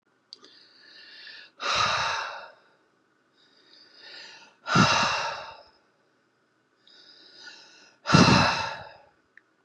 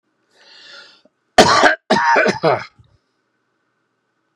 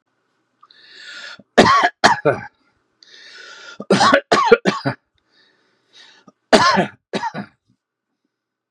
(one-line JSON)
{"exhalation_length": "9.6 s", "exhalation_amplitude": 22280, "exhalation_signal_mean_std_ratio": 0.37, "cough_length": "4.4 s", "cough_amplitude": 32768, "cough_signal_mean_std_ratio": 0.38, "three_cough_length": "8.7 s", "three_cough_amplitude": 32768, "three_cough_signal_mean_std_ratio": 0.37, "survey_phase": "beta (2021-08-13 to 2022-03-07)", "age": "65+", "gender": "Male", "wearing_mask": "No", "symptom_none": true, "symptom_onset": "4 days", "smoker_status": "Ex-smoker", "respiratory_condition_asthma": false, "respiratory_condition_other": false, "recruitment_source": "REACT", "submission_delay": "2 days", "covid_test_result": "Negative", "covid_test_method": "RT-qPCR", "influenza_a_test_result": "Negative", "influenza_b_test_result": "Negative"}